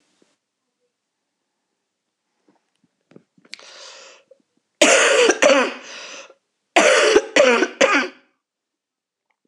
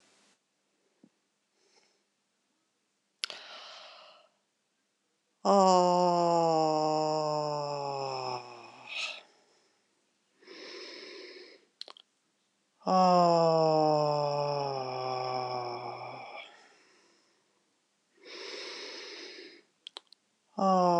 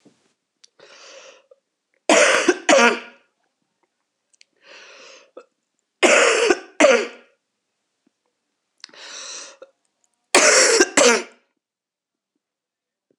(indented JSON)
{
  "cough_length": "9.5 s",
  "cough_amplitude": 26028,
  "cough_signal_mean_std_ratio": 0.38,
  "exhalation_length": "21.0 s",
  "exhalation_amplitude": 9669,
  "exhalation_signal_mean_std_ratio": 0.43,
  "three_cough_length": "13.2 s",
  "three_cough_amplitude": 26028,
  "three_cough_signal_mean_std_ratio": 0.35,
  "survey_phase": "beta (2021-08-13 to 2022-03-07)",
  "age": "45-64",
  "gender": "Female",
  "wearing_mask": "No",
  "symptom_new_continuous_cough": true,
  "symptom_runny_or_blocked_nose": true,
  "symptom_sore_throat": true,
  "symptom_fatigue": true,
  "symptom_fever_high_temperature": true,
  "symptom_headache": true,
  "symptom_change_to_sense_of_smell_or_taste": true,
  "symptom_loss_of_taste": true,
  "symptom_onset": "4 days",
  "smoker_status": "Never smoked",
  "respiratory_condition_asthma": false,
  "respiratory_condition_other": false,
  "recruitment_source": "Test and Trace",
  "submission_delay": "1 day",
  "covid_test_result": "Positive",
  "covid_test_method": "RT-qPCR",
  "covid_ct_value": 15.7,
  "covid_ct_gene": "N gene",
  "covid_ct_mean": 15.8,
  "covid_viral_load": "6500000 copies/ml",
  "covid_viral_load_category": "High viral load (>1M copies/ml)"
}